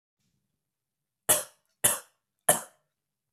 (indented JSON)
{
  "three_cough_length": "3.3 s",
  "three_cough_amplitude": 19323,
  "three_cough_signal_mean_std_ratio": 0.24,
  "survey_phase": "beta (2021-08-13 to 2022-03-07)",
  "age": "18-44",
  "gender": "Male",
  "wearing_mask": "No",
  "symptom_cough_any": true,
  "symptom_runny_or_blocked_nose": true,
  "symptom_fatigue": true,
  "symptom_change_to_sense_of_smell_or_taste": true,
  "symptom_loss_of_taste": true,
  "symptom_onset": "4 days",
  "smoker_status": "Never smoked",
  "respiratory_condition_asthma": false,
  "respiratory_condition_other": false,
  "recruitment_source": "Test and Trace",
  "submission_delay": "2 days",
  "covid_test_result": "Positive",
  "covid_test_method": "RT-qPCR",
  "covid_ct_value": 18.4,
  "covid_ct_gene": "ORF1ab gene",
  "covid_ct_mean": 19.2,
  "covid_viral_load": "510000 copies/ml",
  "covid_viral_load_category": "Low viral load (10K-1M copies/ml)"
}